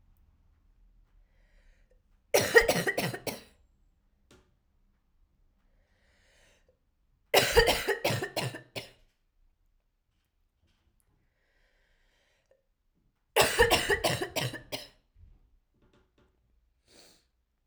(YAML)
three_cough_length: 17.7 s
three_cough_amplitude: 18976
three_cough_signal_mean_std_ratio: 0.29
survey_phase: alpha (2021-03-01 to 2021-08-12)
age: 18-44
gender: Female
wearing_mask: 'No'
symptom_cough_any: true
symptom_shortness_of_breath: true
symptom_fatigue: true
symptom_fever_high_temperature: true
symptom_headache: true
symptom_change_to_sense_of_smell_or_taste: true
symptom_loss_of_taste: true
symptom_onset: 8 days
smoker_status: Ex-smoker
respiratory_condition_asthma: false
respiratory_condition_other: false
recruitment_source: Test and Trace
submission_delay: 1 day
covid_test_result: Positive
covid_test_method: ePCR